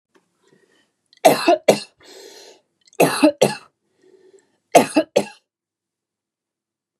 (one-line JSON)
{"three_cough_length": "7.0 s", "three_cough_amplitude": 32768, "three_cough_signal_mean_std_ratio": 0.29, "survey_phase": "beta (2021-08-13 to 2022-03-07)", "age": "45-64", "gender": "Female", "wearing_mask": "No", "symptom_headache": true, "smoker_status": "Ex-smoker", "respiratory_condition_asthma": false, "respiratory_condition_other": false, "recruitment_source": "REACT", "submission_delay": "2 days", "covid_test_result": "Negative", "covid_test_method": "RT-qPCR", "influenza_a_test_result": "Negative", "influenza_b_test_result": "Negative"}